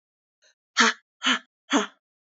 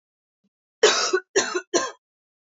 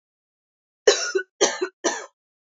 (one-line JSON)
{"exhalation_length": "2.4 s", "exhalation_amplitude": 19106, "exhalation_signal_mean_std_ratio": 0.33, "three_cough_length": "2.6 s", "three_cough_amplitude": 21626, "three_cough_signal_mean_std_ratio": 0.4, "cough_length": "2.6 s", "cough_amplitude": 27797, "cough_signal_mean_std_ratio": 0.36, "survey_phase": "beta (2021-08-13 to 2022-03-07)", "age": "18-44", "gender": "Female", "wearing_mask": "No", "symptom_runny_or_blocked_nose": true, "symptom_shortness_of_breath": true, "symptom_fatigue": true, "symptom_headache": true, "symptom_other": true, "smoker_status": "Ex-smoker", "respiratory_condition_asthma": false, "respiratory_condition_other": false, "recruitment_source": "Test and Trace", "submission_delay": "1 day", "covid_test_result": "Positive", "covid_test_method": "LFT"}